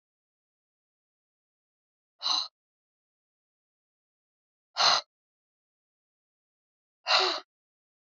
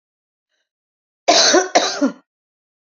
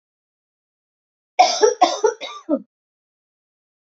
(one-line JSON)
{"exhalation_length": "8.2 s", "exhalation_amplitude": 11925, "exhalation_signal_mean_std_ratio": 0.23, "cough_length": "3.0 s", "cough_amplitude": 31025, "cough_signal_mean_std_ratio": 0.38, "three_cough_length": "3.9 s", "three_cough_amplitude": 27718, "three_cough_signal_mean_std_ratio": 0.31, "survey_phase": "beta (2021-08-13 to 2022-03-07)", "age": "45-64", "gender": "Female", "wearing_mask": "No", "symptom_new_continuous_cough": true, "symptom_runny_or_blocked_nose": true, "symptom_sore_throat": true, "symptom_fatigue": true, "symptom_headache": true, "symptom_onset": "2 days", "smoker_status": "Ex-smoker", "respiratory_condition_asthma": false, "respiratory_condition_other": false, "recruitment_source": "Test and Trace", "submission_delay": "1 day", "covid_test_result": "Positive", "covid_test_method": "ePCR"}